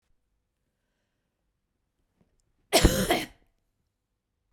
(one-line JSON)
{"cough_length": "4.5 s", "cough_amplitude": 19331, "cough_signal_mean_std_ratio": 0.23, "survey_phase": "beta (2021-08-13 to 2022-03-07)", "age": "45-64", "gender": "Female", "wearing_mask": "No", "symptom_none": true, "symptom_onset": "9 days", "smoker_status": "Never smoked", "respiratory_condition_asthma": false, "respiratory_condition_other": false, "recruitment_source": "REACT", "submission_delay": "6 days", "covid_test_result": "Negative", "covid_test_method": "RT-qPCR"}